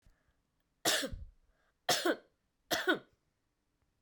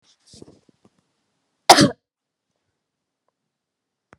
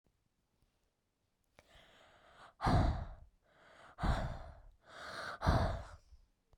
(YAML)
three_cough_length: 4.0 s
three_cough_amplitude: 5040
three_cough_signal_mean_std_ratio: 0.35
cough_length: 4.2 s
cough_amplitude: 32768
cough_signal_mean_std_ratio: 0.16
exhalation_length: 6.6 s
exhalation_amplitude: 4444
exhalation_signal_mean_std_ratio: 0.39
survey_phase: beta (2021-08-13 to 2022-03-07)
age: 45-64
gender: Female
wearing_mask: 'Yes'
symptom_cough_any: true
symptom_sore_throat: true
symptom_abdominal_pain: true
symptom_fatigue: true
symptom_fever_high_temperature: true
symptom_headache: true
symptom_change_to_sense_of_smell_or_taste: true
smoker_status: Never smoked
respiratory_condition_asthma: false
respiratory_condition_other: false
recruitment_source: Test and Trace
submission_delay: 2 days
covid_test_result: Positive
covid_test_method: LFT